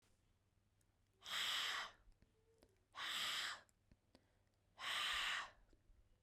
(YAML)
exhalation_length: 6.2 s
exhalation_amplitude: 933
exhalation_signal_mean_std_ratio: 0.51
survey_phase: beta (2021-08-13 to 2022-03-07)
age: 18-44
gender: Female
wearing_mask: 'No'
symptom_runny_or_blocked_nose: true
symptom_sore_throat: true
smoker_status: Never smoked
respiratory_condition_asthma: false
respiratory_condition_other: false
recruitment_source: Test and Trace
submission_delay: 1 day
covid_test_result: Positive
covid_test_method: RT-qPCR
covid_ct_value: 32.6
covid_ct_gene: ORF1ab gene
covid_ct_mean: 34.4
covid_viral_load: 5.3 copies/ml
covid_viral_load_category: Minimal viral load (< 10K copies/ml)